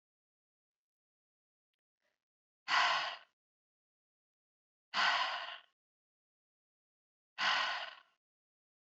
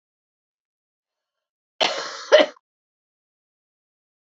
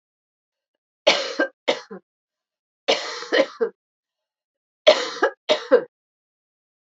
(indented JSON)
{
  "exhalation_length": "8.9 s",
  "exhalation_amplitude": 3787,
  "exhalation_signal_mean_std_ratio": 0.32,
  "cough_length": "4.4 s",
  "cough_amplitude": 26241,
  "cough_signal_mean_std_ratio": 0.2,
  "three_cough_length": "7.0 s",
  "three_cough_amplitude": 28507,
  "three_cough_signal_mean_std_ratio": 0.32,
  "survey_phase": "alpha (2021-03-01 to 2021-08-12)",
  "age": "45-64",
  "gender": "Female",
  "wearing_mask": "No",
  "symptom_cough_any": true,
  "symptom_diarrhoea": true,
  "symptom_fatigue": true,
  "smoker_status": "Ex-smoker",
  "respiratory_condition_asthma": false,
  "respiratory_condition_other": false,
  "recruitment_source": "Test and Trace",
  "submission_delay": "2 days",
  "covid_test_result": "Positive",
  "covid_test_method": "RT-qPCR",
  "covid_ct_value": 20.0,
  "covid_ct_gene": "ORF1ab gene",
  "covid_ct_mean": 20.5,
  "covid_viral_load": "190000 copies/ml",
  "covid_viral_load_category": "Low viral load (10K-1M copies/ml)"
}